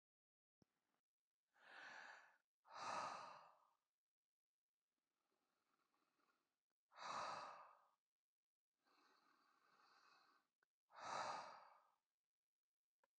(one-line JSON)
{"exhalation_length": "13.2 s", "exhalation_amplitude": 475, "exhalation_signal_mean_std_ratio": 0.35, "survey_phase": "alpha (2021-03-01 to 2021-08-12)", "age": "45-64", "gender": "Male", "wearing_mask": "No", "symptom_none": true, "smoker_status": "Ex-smoker", "respiratory_condition_asthma": false, "respiratory_condition_other": false, "recruitment_source": "REACT", "submission_delay": "1 day", "covid_test_result": "Negative", "covid_test_method": "RT-qPCR"}